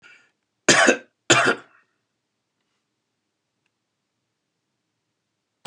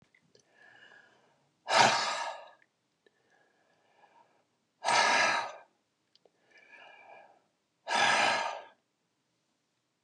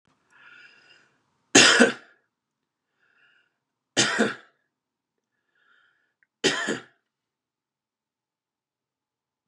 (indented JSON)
{
  "cough_length": "5.7 s",
  "cough_amplitude": 29978,
  "cough_signal_mean_std_ratio": 0.24,
  "exhalation_length": "10.0 s",
  "exhalation_amplitude": 14619,
  "exhalation_signal_mean_std_ratio": 0.36,
  "three_cough_length": "9.5 s",
  "three_cough_amplitude": 29981,
  "three_cough_signal_mean_std_ratio": 0.23,
  "survey_phase": "beta (2021-08-13 to 2022-03-07)",
  "age": "65+",
  "gender": "Male",
  "wearing_mask": "No",
  "symptom_none": true,
  "smoker_status": "Ex-smoker",
  "respiratory_condition_asthma": false,
  "respiratory_condition_other": false,
  "recruitment_source": "REACT",
  "submission_delay": "3 days",
  "covid_test_result": "Negative",
  "covid_test_method": "RT-qPCR",
  "influenza_a_test_result": "Negative",
  "influenza_b_test_result": "Negative"
}